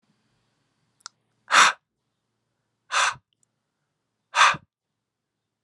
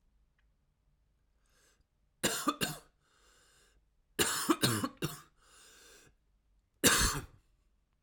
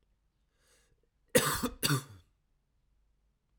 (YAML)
exhalation_length: 5.6 s
exhalation_amplitude: 25983
exhalation_signal_mean_std_ratio: 0.25
three_cough_length: 8.0 s
three_cough_amplitude: 9796
three_cough_signal_mean_std_ratio: 0.33
cough_length: 3.6 s
cough_amplitude: 10230
cough_signal_mean_std_ratio: 0.29
survey_phase: alpha (2021-03-01 to 2021-08-12)
age: 18-44
gender: Male
wearing_mask: 'No'
symptom_cough_any: true
symptom_onset: 10 days
smoker_status: Never smoked
respiratory_condition_asthma: false
respiratory_condition_other: false
recruitment_source: REACT
submission_delay: 2 days
covid_test_result: Negative
covid_test_method: RT-qPCR